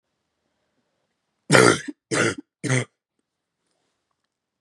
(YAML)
three_cough_length: 4.6 s
three_cough_amplitude: 32768
three_cough_signal_mean_std_ratio: 0.28
survey_phase: beta (2021-08-13 to 2022-03-07)
age: 18-44
gender: Female
wearing_mask: 'No'
symptom_cough_any: true
symptom_new_continuous_cough: true
symptom_runny_or_blocked_nose: true
symptom_sore_throat: true
symptom_fatigue: true
symptom_headache: true
symptom_change_to_sense_of_smell_or_taste: true
smoker_status: Never smoked
respiratory_condition_asthma: true
respiratory_condition_other: false
recruitment_source: Test and Trace
submission_delay: 12 days
covid_test_result: Negative
covid_test_method: RT-qPCR